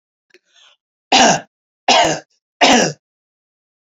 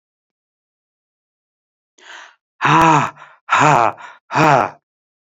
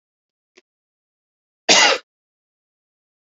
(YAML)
three_cough_length: 3.8 s
three_cough_amplitude: 32768
three_cough_signal_mean_std_ratio: 0.39
exhalation_length: 5.2 s
exhalation_amplitude: 31248
exhalation_signal_mean_std_ratio: 0.39
cough_length: 3.3 s
cough_amplitude: 32768
cough_signal_mean_std_ratio: 0.23
survey_phase: alpha (2021-03-01 to 2021-08-12)
age: 45-64
gender: Male
wearing_mask: 'No'
symptom_cough_any: true
smoker_status: Never smoked
respiratory_condition_asthma: false
respiratory_condition_other: false
recruitment_source: Test and Trace
submission_delay: 2 days
covid_test_result: Positive
covid_test_method: LFT